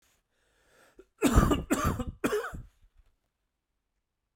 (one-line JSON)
{"three_cough_length": "4.4 s", "three_cough_amplitude": 12689, "three_cough_signal_mean_std_ratio": 0.37, "survey_phase": "beta (2021-08-13 to 2022-03-07)", "age": "45-64", "gender": "Male", "wearing_mask": "No", "symptom_cough_any": true, "symptom_runny_or_blocked_nose": true, "symptom_onset": "4 days", "smoker_status": "Never smoked", "respiratory_condition_asthma": false, "respiratory_condition_other": false, "recruitment_source": "Test and Trace", "submission_delay": "2 days", "covid_test_result": "Positive", "covid_test_method": "RT-qPCR", "covid_ct_value": 12.4, "covid_ct_gene": "ORF1ab gene"}